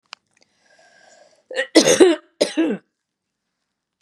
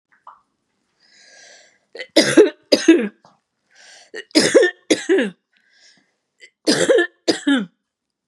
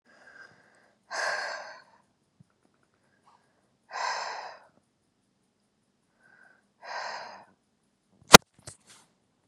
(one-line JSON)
{"cough_length": "4.0 s", "cough_amplitude": 32766, "cough_signal_mean_std_ratio": 0.32, "three_cough_length": "8.3 s", "three_cough_amplitude": 32768, "three_cough_signal_mean_std_ratio": 0.38, "exhalation_length": "9.5 s", "exhalation_amplitude": 32768, "exhalation_signal_mean_std_ratio": 0.13, "survey_phase": "beta (2021-08-13 to 2022-03-07)", "age": "45-64", "gender": "Female", "wearing_mask": "No", "symptom_none": true, "smoker_status": "Never smoked", "respiratory_condition_asthma": false, "respiratory_condition_other": false, "recruitment_source": "REACT", "submission_delay": "3 days", "covid_test_result": "Negative", "covid_test_method": "RT-qPCR", "influenza_a_test_result": "Negative", "influenza_b_test_result": "Negative"}